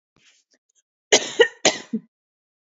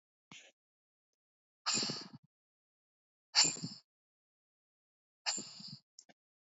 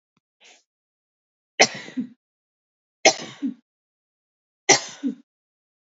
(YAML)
cough_length: 2.7 s
cough_amplitude: 29735
cough_signal_mean_std_ratio: 0.26
exhalation_length: 6.6 s
exhalation_amplitude: 7733
exhalation_signal_mean_std_ratio: 0.26
three_cough_length: 5.9 s
three_cough_amplitude: 31348
three_cough_signal_mean_std_ratio: 0.22
survey_phase: beta (2021-08-13 to 2022-03-07)
age: 18-44
gender: Female
wearing_mask: 'No'
symptom_cough_any: true
symptom_runny_or_blocked_nose: true
symptom_sore_throat: true
symptom_fatigue: true
symptom_onset: 4 days
smoker_status: Never smoked
respiratory_condition_asthma: false
respiratory_condition_other: false
recruitment_source: Test and Trace
submission_delay: 1 day
covid_test_result: Positive
covid_test_method: RT-qPCR
covid_ct_value: 29.0
covid_ct_gene: ORF1ab gene
covid_ct_mean: 29.1
covid_viral_load: 290 copies/ml
covid_viral_load_category: Minimal viral load (< 10K copies/ml)